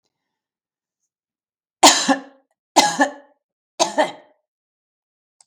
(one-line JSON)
{"three_cough_length": "5.5 s", "three_cough_amplitude": 32768, "three_cough_signal_mean_std_ratio": 0.28, "survey_phase": "beta (2021-08-13 to 2022-03-07)", "age": "45-64", "gender": "Female", "wearing_mask": "No", "symptom_none": true, "symptom_onset": "11 days", "smoker_status": "Ex-smoker", "respiratory_condition_asthma": false, "respiratory_condition_other": false, "recruitment_source": "REACT", "submission_delay": "3 days", "covid_test_result": "Negative", "covid_test_method": "RT-qPCR", "influenza_a_test_result": "Negative", "influenza_b_test_result": "Negative"}